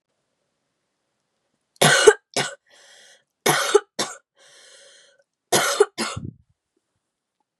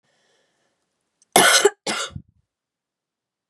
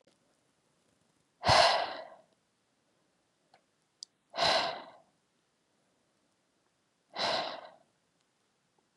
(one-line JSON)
{"three_cough_length": "7.6 s", "three_cough_amplitude": 32767, "three_cough_signal_mean_std_ratio": 0.29, "cough_length": "3.5 s", "cough_amplitude": 32768, "cough_signal_mean_std_ratio": 0.28, "exhalation_length": "9.0 s", "exhalation_amplitude": 9802, "exhalation_signal_mean_std_ratio": 0.29, "survey_phase": "beta (2021-08-13 to 2022-03-07)", "age": "18-44", "gender": "Female", "wearing_mask": "No", "symptom_cough_any": true, "symptom_sore_throat": true, "symptom_headache": true, "symptom_change_to_sense_of_smell_or_taste": true, "symptom_other": true, "symptom_onset": "4 days", "smoker_status": "Current smoker (e-cigarettes or vapes only)", "respiratory_condition_asthma": false, "respiratory_condition_other": false, "recruitment_source": "Test and Trace", "submission_delay": "2 days", "covid_test_result": "Positive", "covid_test_method": "RT-qPCR", "covid_ct_value": 24.9, "covid_ct_gene": "ORF1ab gene", "covid_ct_mean": 25.0, "covid_viral_load": "6100 copies/ml", "covid_viral_load_category": "Minimal viral load (< 10K copies/ml)"}